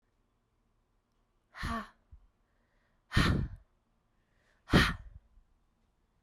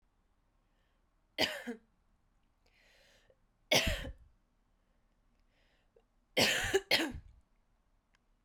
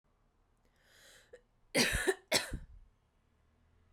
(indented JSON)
{
  "exhalation_length": "6.2 s",
  "exhalation_amplitude": 9924,
  "exhalation_signal_mean_std_ratio": 0.27,
  "three_cough_length": "8.4 s",
  "three_cough_amplitude": 6277,
  "three_cough_signal_mean_std_ratio": 0.3,
  "cough_length": "3.9 s",
  "cough_amplitude": 6091,
  "cough_signal_mean_std_ratio": 0.32,
  "survey_phase": "beta (2021-08-13 to 2022-03-07)",
  "age": "18-44",
  "gender": "Female",
  "wearing_mask": "No",
  "symptom_cough_any": true,
  "symptom_runny_or_blocked_nose": true,
  "symptom_fatigue": true,
  "symptom_headache": true,
  "symptom_change_to_sense_of_smell_or_taste": true,
  "symptom_loss_of_taste": true,
  "smoker_status": "Ex-smoker",
  "respiratory_condition_asthma": false,
  "respiratory_condition_other": false,
  "recruitment_source": "Test and Trace",
  "submission_delay": "2 days",
  "covid_test_result": "Positive",
  "covid_test_method": "ePCR"
}